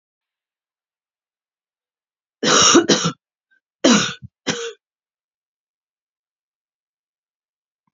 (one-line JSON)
{"three_cough_length": "7.9 s", "three_cough_amplitude": 30762, "three_cough_signal_mean_std_ratio": 0.28, "survey_phase": "beta (2021-08-13 to 2022-03-07)", "age": "45-64", "gender": "Female", "wearing_mask": "No", "symptom_none": true, "smoker_status": "Never smoked", "respiratory_condition_asthma": false, "respiratory_condition_other": false, "recruitment_source": "REACT", "submission_delay": "4 days", "covid_test_result": "Negative", "covid_test_method": "RT-qPCR", "influenza_a_test_result": "Negative", "influenza_b_test_result": "Negative"}